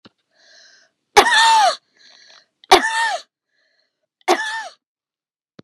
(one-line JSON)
{"three_cough_length": "5.6 s", "three_cough_amplitude": 32768, "three_cough_signal_mean_std_ratio": 0.37, "survey_phase": "beta (2021-08-13 to 2022-03-07)", "age": "45-64", "gender": "Female", "wearing_mask": "No", "symptom_none": true, "smoker_status": "Ex-smoker", "respiratory_condition_asthma": false, "respiratory_condition_other": false, "recruitment_source": "REACT", "submission_delay": "1 day", "covid_test_result": "Negative", "covid_test_method": "RT-qPCR", "influenza_a_test_result": "Negative", "influenza_b_test_result": "Negative"}